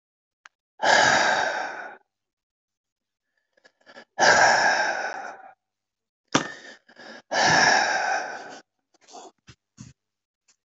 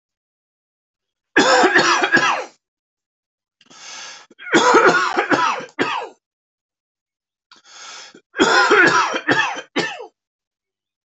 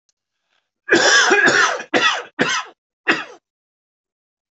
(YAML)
exhalation_length: 10.7 s
exhalation_amplitude: 20476
exhalation_signal_mean_std_ratio: 0.44
three_cough_length: 11.1 s
three_cough_amplitude: 30243
three_cough_signal_mean_std_ratio: 0.48
cough_length: 4.5 s
cough_amplitude: 27453
cough_signal_mean_std_ratio: 0.49
survey_phase: alpha (2021-03-01 to 2021-08-12)
age: 65+
gender: Male
wearing_mask: 'No'
symptom_cough_any: true
symptom_shortness_of_breath: true
symptom_headache: true
symptom_onset: 8 days
smoker_status: Ex-smoker
respiratory_condition_asthma: false
respiratory_condition_other: false
recruitment_source: REACT
submission_delay: 3 days
covid_test_result: Negative
covid_test_method: RT-qPCR